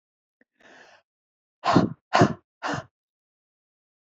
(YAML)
exhalation_length: 4.0 s
exhalation_amplitude: 20650
exhalation_signal_mean_std_ratio: 0.27
survey_phase: alpha (2021-03-01 to 2021-08-12)
age: 45-64
gender: Female
wearing_mask: 'No'
symptom_none: true
smoker_status: Never smoked
respiratory_condition_asthma: true
respiratory_condition_other: false
recruitment_source: REACT
submission_delay: 2 days
covid_test_result: Negative
covid_test_method: RT-qPCR